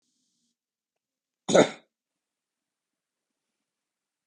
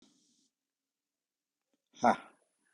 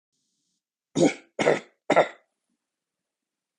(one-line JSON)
{"cough_length": "4.3 s", "cough_amplitude": 18338, "cough_signal_mean_std_ratio": 0.15, "exhalation_length": "2.7 s", "exhalation_amplitude": 7623, "exhalation_signal_mean_std_ratio": 0.17, "three_cough_length": "3.6 s", "three_cough_amplitude": 18355, "three_cough_signal_mean_std_ratio": 0.28, "survey_phase": "beta (2021-08-13 to 2022-03-07)", "age": "45-64", "gender": "Male", "wearing_mask": "No", "symptom_none": true, "smoker_status": "Never smoked", "respiratory_condition_asthma": false, "respiratory_condition_other": false, "recruitment_source": "REACT", "submission_delay": "2 days", "covid_test_result": "Negative", "covid_test_method": "RT-qPCR"}